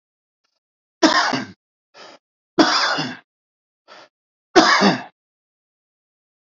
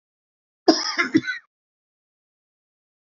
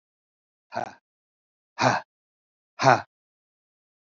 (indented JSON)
{
  "three_cough_length": "6.5 s",
  "three_cough_amplitude": 32768,
  "three_cough_signal_mean_std_ratio": 0.35,
  "cough_length": "3.2 s",
  "cough_amplitude": 26667,
  "cough_signal_mean_std_ratio": 0.26,
  "exhalation_length": "4.1 s",
  "exhalation_amplitude": 22815,
  "exhalation_signal_mean_std_ratio": 0.24,
  "survey_phase": "alpha (2021-03-01 to 2021-08-12)",
  "age": "45-64",
  "gender": "Male",
  "wearing_mask": "No",
  "symptom_cough_any": true,
  "symptom_new_continuous_cough": true,
  "symptom_shortness_of_breath": true,
  "symptom_fatigue": true,
  "symptom_change_to_sense_of_smell_or_taste": true,
  "symptom_onset": "64 days",
  "smoker_status": "Ex-smoker",
  "respiratory_condition_asthma": false,
  "respiratory_condition_other": false,
  "recruitment_source": "Test and Trace",
  "submission_delay": "2 days",
  "covid_test_result": "Positive",
  "covid_test_method": "RT-qPCR",
  "covid_ct_value": 20.1,
  "covid_ct_gene": "ORF1ab gene"
}